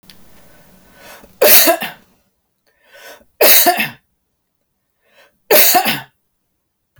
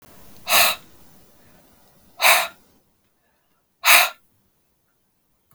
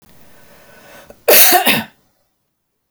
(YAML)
three_cough_length: 7.0 s
three_cough_amplitude: 32768
three_cough_signal_mean_std_ratio: 0.36
exhalation_length: 5.5 s
exhalation_amplitude: 32768
exhalation_signal_mean_std_ratio: 0.3
cough_length: 2.9 s
cough_amplitude: 32768
cough_signal_mean_std_ratio: 0.36
survey_phase: beta (2021-08-13 to 2022-03-07)
age: 45-64
gender: Female
wearing_mask: 'No'
symptom_none: true
smoker_status: Never smoked
respiratory_condition_asthma: false
respiratory_condition_other: false
recruitment_source: REACT
submission_delay: 1 day
covid_test_result: Negative
covid_test_method: RT-qPCR